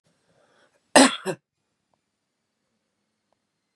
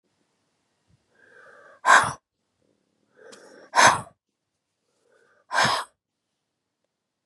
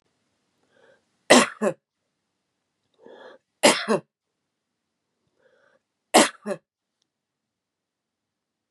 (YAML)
cough_length: 3.8 s
cough_amplitude: 30314
cough_signal_mean_std_ratio: 0.18
exhalation_length: 7.3 s
exhalation_amplitude: 25649
exhalation_signal_mean_std_ratio: 0.25
three_cough_length: 8.7 s
three_cough_amplitude: 32499
three_cough_signal_mean_std_ratio: 0.21
survey_phase: beta (2021-08-13 to 2022-03-07)
age: 45-64
gender: Female
wearing_mask: 'No'
symptom_none: true
symptom_onset: 6 days
smoker_status: Ex-smoker
respiratory_condition_asthma: false
respiratory_condition_other: true
recruitment_source: REACT
submission_delay: 3 days
covid_test_result: Negative
covid_test_method: RT-qPCR
influenza_a_test_result: Negative
influenza_b_test_result: Negative